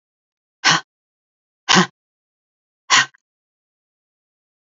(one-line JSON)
{"exhalation_length": "4.8 s", "exhalation_amplitude": 32768, "exhalation_signal_mean_std_ratio": 0.24, "survey_phase": "beta (2021-08-13 to 2022-03-07)", "age": "45-64", "gender": "Female", "wearing_mask": "No", "symptom_cough_any": true, "symptom_runny_or_blocked_nose": true, "symptom_diarrhoea": true, "symptom_onset": "12 days", "smoker_status": "Never smoked", "respiratory_condition_asthma": true, "respiratory_condition_other": false, "recruitment_source": "REACT", "submission_delay": "2 days", "covid_test_result": "Negative", "covid_test_method": "RT-qPCR"}